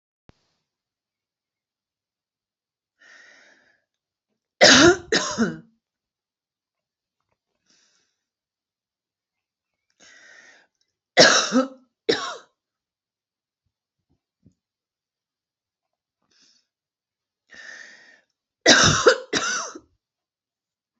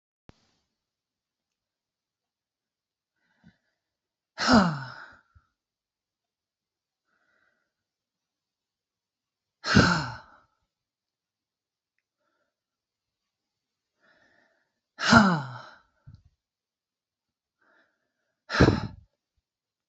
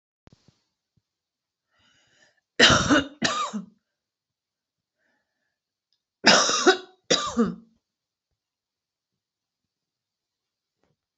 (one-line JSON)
{"three_cough_length": "21.0 s", "three_cough_amplitude": 32768, "three_cough_signal_mean_std_ratio": 0.23, "exhalation_length": "19.9 s", "exhalation_amplitude": 26149, "exhalation_signal_mean_std_ratio": 0.2, "cough_length": "11.2 s", "cough_amplitude": 28284, "cough_signal_mean_std_ratio": 0.28, "survey_phase": "alpha (2021-03-01 to 2021-08-12)", "age": "45-64", "gender": "Female", "wearing_mask": "No", "symptom_cough_any": true, "symptom_shortness_of_breath": true, "smoker_status": "Ex-smoker", "respiratory_condition_asthma": false, "respiratory_condition_other": true, "recruitment_source": "REACT", "submission_delay": "1 day", "covid_test_result": "Negative", "covid_test_method": "RT-qPCR"}